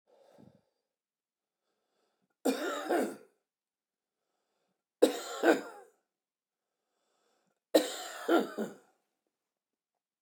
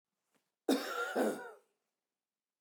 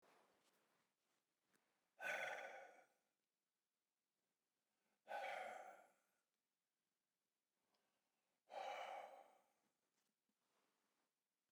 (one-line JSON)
{"three_cough_length": "10.2 s", "three_cough_amplitude": 11730, "three_cough_signal_mean_std_ratio": 0.28, "cough_length": "2.6 s", "cough_amplitude": 3881, "cough_signal_mean_std_ratio": 0.41, "exhalation_length": "11.5 s", "exhalation_amplitude": 623, "exhalation_signal_mean_std_ratio": 0.35, "survey_phase": "beta (2021-08-13 to 2022-03-07)", "age": "45-64", "gender": "Male", "wearing_mask": "No", "symptom_fatigue": true, "symptom_other": true, "symptom_onset": "4 days", "smoker_status": "Ex-smoker", "respiratory_condition_asthma": false, "respiratory_condition_other": false, "recruitment_source": "REACT", "submission_delay": "3 days", "covid_test_result": "Negative", "covid_test_method": "RT-qPCR", "influenza_a_test_result": "Negative", "influenza_b_test_result": "Negative"}